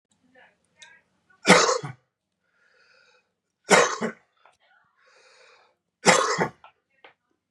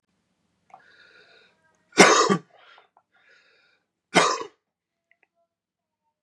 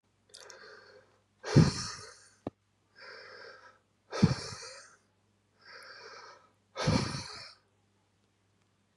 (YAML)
three_cough_length: 7.5 s
three_cough_amplitude: 30839
three_cough_signal_mean_std_ratio: 0.28
cough_length: 6.2 s
cough_amplitude: 32767
cough_signal_mean_std_ratio: 0.24
exhalation_length: 9.0 s
exhalation_amplitude: 10671
exhalation_signal_mean_std_ratio: 0.28
survey_phase: beta (2021-08-13 to 2022-03-07)
age: 18-44
gender: Male
wearing_mask: 'No'
symptom_cough_any: true
symptom_runny_or_blocked_nose: true
symptom_shortness_of_breath: true
symptom_fatigue: true
symptom_onset: 4 days
smoker_status: Never smoked
respiratory_condition_asthma: true
respiratory_condition_other: false
recruitment_source: Test and Trace
submission_delay: 2 days
covid_test_result: Positive
covid_test_method: RT-qPCR
covid_ct_value: 17.5
covid_ct_gene: ORF1ab gene